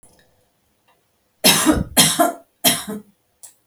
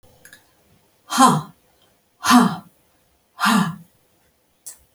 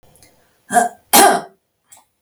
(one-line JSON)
{"three_cough_length": "3.7 s", "three_cough_amplitude": 32768, "three_cough_signal_mean_std_ratio": 0.4, "exhalation_length": "4.9 s", "exhalation_amplitude": 31519, "exhalation_signal_mean_std_ratio": 0.34, "cough_length": "2.2 s", "cough_amplitude": 32768, "cough_signal_mean_std_ratio": 0.36, "survey_phase": "beta (2021-08-13 to 2022-03-07)", "age": "45-64", "gender": "Female", "wearing_mask": "No", "symptom_none": true, "smoker_status": "Never smoked", "respiratory_condition_asthma": false, "respiratory_condition_other": false, "recruitment_source": "REACT", "submission_delay": "2 days", "covid_test_result": "Negative", "covid_test_method": "RT-qPCR"}